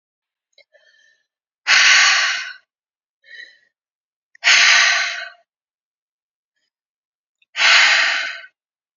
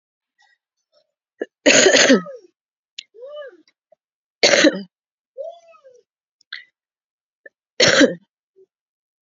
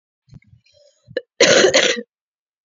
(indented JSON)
{
  "exhalation_length": "9.0 s",
  "exhalation_amplitude": 32342,
  "exhalation_signal_mean_std_ratio": 0.41,
  "three_cough_length": "9.2 s",
  "three_cough_amplitude": 30967,
  "three_cough_signal_mean_std_ratio": 0.3,
  "cough_length": "2.6 s",
  "cough_amplitude": 32767,
  "cough_signal_mean_std_ratio": 0.38,
  "survey_phase": "beta (2021-08-13 to 2022-03-07)",
  "age": "18-44",
  "gender": "Female",
  "wearing_mask": "No",
  "symptom_cough_any": true,
  "symptom_runny_or_blocked_nose": true,
  "symptom_fatigue": true,
  "symptom_headache": true,
  "symptom_onset": "3 days",
  "smoker_status": "Ex-smoker",
  "respiratory_condition_asthma": false,
  "respiratory_condition_other": false,
  "recruitment_source": "Test and Trace",
  "submission_delay": "1 day",
  "covid_test_result": "Positive",
  "covid_test_method": "RT-qPCR",
  "covid_ct_value": 22.2,
  "covid_ct_gene": "ORF1ab gene",
  "covid_ct_mean": 22.8,
  "covid_viral_load": "33000 copies/ml",
  "covid_viral_load_category": "Low viral load (10K-1M copies/ml)"
}